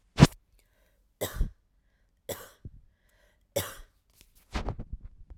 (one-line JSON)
{"three_cough_length": "5.4 s", "three_cough_amplitude": 25970, "three_cough_signal_mean_std_ratio": 0.22, "survey_phase": "alpha (2021-03-01 to 2021-08-12)", "age": "18-44", "gender": "Female", "wearing_mask": "No", "symptom_none": true, "smoker_status": "Never smoked", "respiratory_condition_asthma": false, "respiratory_condition_other": false, "recruitment_source": "REACT", "submission_delay": "1 day", "covid_test_result": "Negative", "covid_test_method": "RT-qPCR"}